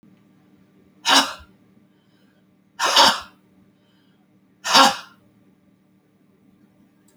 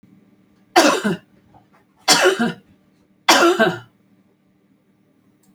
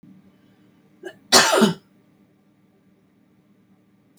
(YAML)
exhalation_length: 7.2 s
exhalation_amplitude: 32768
exhalation_signal_mean_std_ratio: 0.28
three_cough_length: 5.5 s
three_cough_amplitude: 32767
three_cough_signal_mean_std_ratio: 0.38
cough_length: 4.2 s
cough_amplitude: 30818
cough_signal_mean_std_ratio: 0.26
survey_phase: alpha (2021-03-01 to 2021-08-12)
age: 65+
gender: Female
wearing_mask: 'No'
symptom_none: true
smoker_status: Ex-smoker
respiratory_condition_asthma: false
respiratory_condition_other: false
recruitment_source: REACT
submission_delay: 5 days
covid_test_result: Negative
covid_test_method: RT-qPCR